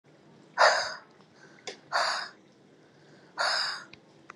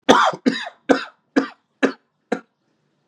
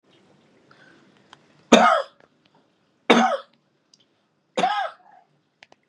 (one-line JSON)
{"exhalation_length": "4.4 s", "exhalation_amplitude": 13794, "exhalation_signal_mean_std_ratio": 0.4, "cough_length": "3.1 s", "cough_amplitude": 32768, "cough_signal_mean_std_ratio": 0.36, "three_cough_length": "5.9 s", "three_cough_amplitude": 32768, "three_cough_signal_mean_std_ratio": 0.29, "survey_phase": "beta (2021-08-13 to 2022-03-07)", "age": "18-44", "gender": "Male", "wearing_mask": "No", "symptom_cough_any": true, "symptom_runny_or_blocked_nose": true, "symptom_sore_throat": true, "symptom_onset": "8 days", "smoker_status": "Never smoked", "respiratory_condition_asthma": false, "respiratory_condition_other": false, "recruitment_source": "Test and Trace", "submission_delay": "2 days", "covid_test_result": "Positive", "covid_test_method": "RT-qPCR", "covid_ct_value": 23.1, "covid_ct_gene": "ORF1ab gene", "covid_ct_mean": 23.4, "covid_viral_load": "21000 copies/ml", "covid_viral_load_category": "Low viral load (10K-1M copies/ml)"}